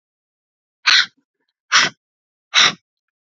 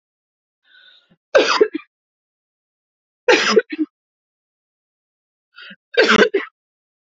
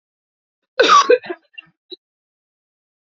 {
  "exhalation_length": "3.3 s",
  "exhalation_amplitude": 32768,
  "exhalation_signal_mean_std_ratio": 0.31,
  "three_cough_length": "7.2 s",
  "three_cough_amplitude": 31294,
  "three_cough_signal_mean_std_ratio": 0.31,
  "cough_length": "3.2 s",
  "cough_amplitude": 28538,
  "cough_signal_mean_std_ratio": 0.29,
  "survey_phase": "beta (2021-08-13 to 2022-03-07)",
  "age": "18-44",
  "gender": "Female",
  "wearing_mask": "No",
  "symptom_none": true,
  "smoker_status": "Current smoker (11 or more cigarettes per day)",
  "respiratory_condition_asthma": false,
  "respiratory_condition_other": false,
  "recruitment_source": "REACT",
  "submission_delay": "1 day",
  "covid_test_result": "Negative",
  "covid_test_method": "RT-qPCR",
  "influenza_a_test_result": "Negative",
  "influenza_b_test_result": "Negative"
}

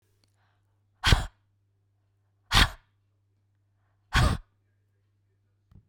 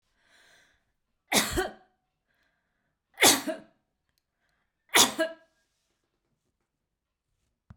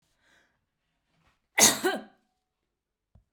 {
  "exhalation_length": "5.9 s",
  "exhalation_amplitude": 19808,
  "exhalation_signal_mean_std_ratio": 0.25,
  "three_cough_length": "7.8 s",
  "three_cough_amplitude": 20084,
  "three_cough_signal_mean_std_ratio": 0.24,
  "cough_length": "3.3 s",
  "cough_amplitude": 19459,
  "cough_signal_mean_std_ratio": 0.23,
  "survey_phase": "beta (2021-08-13 to 2022-03-07)",
  "age": "65+",
  "gender": "Female",
  "wearing_mask": "No",
  "symptom_none": true,
  "smoker_status": "Never smoked",
  "respiratory_condition_asthma": false,
  "respiratory_condition_other": false,
  "recruitment_source": "REACT",
  "submission_delay": "3 days",
  "covid_test_result": "Negative",
  "covid_test_method": "RT-qPCR",
  "influenza_a_test_result": "Negative",
  "influenza_b_test_result": "Negative"
}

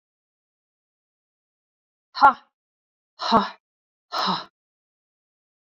{
  "exhalation_length": "5.6 s",
  "exhalation_amplitude": 23856,
  "exhalation_signal_mean_std_ratio": 0.23,
  "survey_phase": "beta (2021-08-13 to 2022-03-07)",
  "age": "45-64",
  "gender": "Female",
  "wearing_mask": "No",
  "symptom_none": true,
  "smoker_status": "Never smoked",
  "respiratory_condition_asthma": false,
  "respiratory_condition_other": false,
  "recruitment_source": "Test and Trace",
  "submission_delay": "0 days",
  "covid_test_result": "Negative",
  "covid_test_method": "LFT"
}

